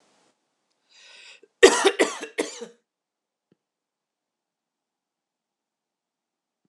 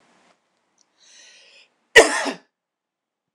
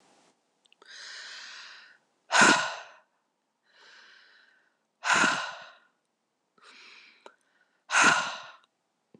{"three_cough_length": "6.7 s", "three_cough_amplitude": 26028, "three_cough_signal_mean_std_ratio": 0.19, "cough_length": "3.3 s", "cough_amplitude": 26028, "cough_signal_mean_std_ratio": 0.2, "exhalation_length": "9.2 s", "exhalation_amplitude": 17975, "exhalation_signal_mean_std_ratio": 0.31, "survey_phase": "beta (2021-08-13 to 2022-03-07)", "age": "45-64", "gender": "Female", "wearing_mask": "No", "symptom_none": true, "smoker_status": "Never smoked", "respiratory_condition_asthma": false, "respiratory_condition_other": false, "recruitment_source": "REACT", "submission_delay": "1 day", "covid_test_result": "Negative", "covid_test_method": "RT-qPCR", "influenza_a_test_result": "Negative", "influenza_b_test_result": "Negative"}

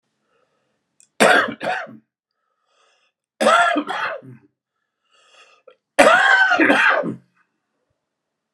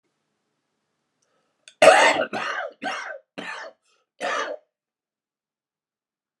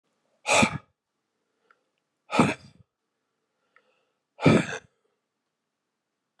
{"three_cough_length": "8.5 s", "three_cough_amplitude": 32768, "three_cough_signal_mean_std_ratio": 0.42, "cough_length": "6.4 s", "cough_amplitude": 30295, "cough_signal_mean_std_ratio": 0.29, "exhalation_length": "6.4 s", "exhalation_amplitude": 17743, "exhalation_signal_mean_std_ratio": 0.26, "survey_phase": "beta (2021-08-13 to 2022-03-07)", "age": "65+", "gender": "Male", "wearing_mask": "No", "symptom_cough_any": true, "symptom_new_continuous_cough": true, "symptom_runny_or_blocked_nose": true, "symptom_fatigue": true, "symptom_headache": true, "symptom_change_to_sense_of_smell_or_taste": true, "symptom_onset": "7 days", "smoker_status": "Never smoked", "respiratory_condition_asthma": false, "respiratory_condition_other": false, "recruitment_source": "Test and Trace", "submission_delay": "2 days", "covid_test_result": "Positive", "covid_test_method": "RT-qPCR", "covid_ct_value": 18.4, "covid_ct_gene": "N gene"}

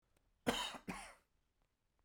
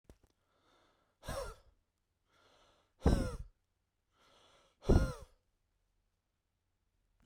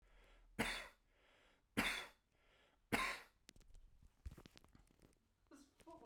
{"cough_length": "2.0 s", "cough_amplitude": 2760, "cough_signal_mean_std_ratio": 0.34, "exhalation_length": "7.3 s", "exhalation_amplitude": 5649, "exhalation_signal_mean_std_ratio": 0.23, "three_cough_length": "6.1 s", "three_cough_amplitude": 2233, "three_cough_signal_mean_std_ratio": 0.35, "survey_phase": "beta (2021-08-13 to 2022-03-07)", "age": "18-44", "gender": "Male", "wearing_mask": "No", "symptom_shortness_of_breath": true, "symptom_diarrhoea": true, "symptom_fatigue": true, "symptom_headache": true, "symptom_change_to_sense_of_smell_or_taste": true, "symptom_loss_of_taste": true, "symptom_onset": "3 days", "smoker_status": "Ex-smoker", "respiratory_condition_asthma": false, "respiratory_condition_other": false, "recruitment_source": "Test and Trace", "submission_delay": "2 days", "covid_test_result": "Positive", "covid_test_method": "RT-qPCR", "covid_ct_value": 35.0, "covid_ct_gene": "N gene"}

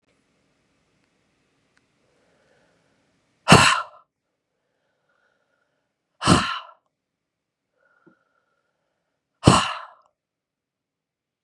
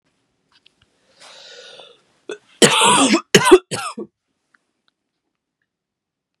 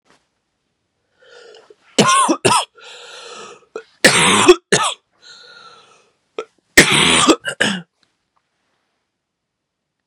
{"exhalation_length": "11.4 s", "exhalation_amplitude": 32768, "exhalation_signal_mean_std_ratio": 0.2, "cough_length": "6.4 s", "cough_amplitude": 32768, "cough_signal_mean_std_ratio": 0.29, "three_cough_length": "10.1 s", "three_cough_amplitude": 32768, "three_cough_signal_mean_std_ratio": 0.37, "survey_phase": "beta (2021-08-13 to 2022-03-07)", "age": "18-44", "gender": "Female", "wearing_mask": "No", "symptom_cough_any": true, "symptom_new_continuous_cough": true, "symptom_runny_or_blocked_nose": true, "symptom_sore_throat": true, "symptom_fatigue": true, "symptom_headache": true, "symptom_onset": "5 days", "smoker_status": "Never smoked", "respiratory_condition_asthma": false, "respiratory_condition_other": false, "recruitment_source": "Test and Trace", "submission_delay": "1 day", "covid_test_result": "Positive", "covid_test_method": "RT-qPCR", "covid_ct_value": 19.1, "covid_ct_gene": "N gene"}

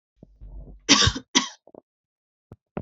{"cough_length": "2.8 s", "cough_amplitude": 26170, "cough_signal_mean_std_ratio": 0.3, "survey_phase": "beta (2021-08-13 to 2022-03-07)", "age": "18-44", "gender": "Female", "wearing_mask": "No", "symptom_sore_throat": true, "smoker_status": "Never smoked", "respiratory_condition_asthma": false, "respiratory_condition_other": false, "recruitment_source": "Test and Trace", "submission_delay": "0 days", "covid_test_result": "Negative", "covid_test_method": "RT-qPCR"}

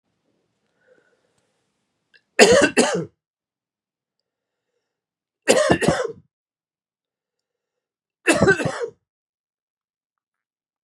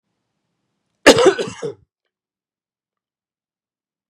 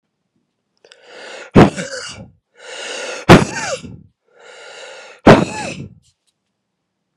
{"three_cough_length": "10.8 s", "three_cough_amplitude": 32768, "three_cough_signal_mean_std_ratio": 0.28, "cough_length": "4.1 s", "cough_amplitude": 32768, "cough_signal_mean_std_ratio": 0.22, "exhalation_length": "7.2 s", "exhalation_amplitude": 32768, "exhalation_signal_mean_std_ratio": 0.29, "survey_phase": "beta (2021-08-13 to 2022-03-07)", "age": "45-64", "gender": "Male", "wearing_mask": "No", "symptom_cough_any": true, "symptom_runny_or_blocked_nose": true, "symptom_fatigue": true, "symptom_change_to_sense_of_smell_or_taste": true, "symptom_loss_of_taste": true, "symptom_onset": "5 days", "smoker_status": "Never smoked", "respiratory_condition_asthma": false, "respiratory_condition_other": false, "recruitment_source": "Test and Trace", "submission_delay": "2 days", "covid_test_result": "Positive", "covid_test_method": "RT-qPCR", "covid_ct_value": 13.5, "covid_ct_gene": "ORF1ab gene", "covid_ct_mean": 13.9, "covid_viral_load": "27000000 copies/ml", "covid_viral_load_category": "High viral load (>1M copies/ml)"}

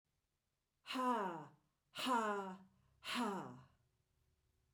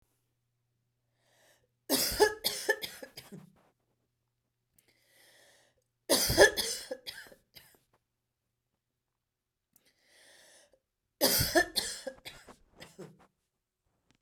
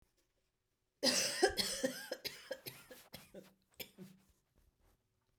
{"exhalation_length": "4.7 s", "exhalation_amplitude": 1798, "exhalation_signal_mean_std_ratio": 0.49, "three_cough_length": "14.2 s", "three_cough_amplitude": 19203, "three_cough_signal_mean_std_ratio": 0.27, "cough_length": "5.4 s", "cough_amplitude": 4537, "cough_signal_mean_std_ratio": 0.36, "survey_phase": "beta (2021-08-13 to 2022-03-07)", "age": "45-64", "gender": "Female", "wearing_mask": "No", "symptom_cough_any": true, "symptom_fatigue": true, "symptom_fever_high_temperature": true, "symptom_headache": true, "smoker_status": "Ex-smoker", "respiratory_condition_asthma": false, "respiratory_condition_other": false, "recruitment_source": "Test and Trace", "submission_delay": "3 days", "covid_test_result": "Positive", "covid_test_method": "LFT"}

